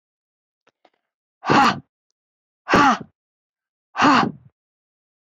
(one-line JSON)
{"exhalation_length": "5.2 s", "exhalation_amplitude": 26373, "exhalation_signal_mean_std_ratio": 0.33, "survey_phase": "beta (2021-08-13 to 2022-03-07)", "age": "45-64", "gender": "Female", "wearing_mask": "No", "symptom_none": true, "smoker_status": "Never smoked", "respiratory_condition_asthma": false, "respiratory_condition_other": false, "recruitment_source": "REACT", "submission_delay": "1 day", "covid_test_result": "Negative", "covid_test_method": "RT-qPCR"}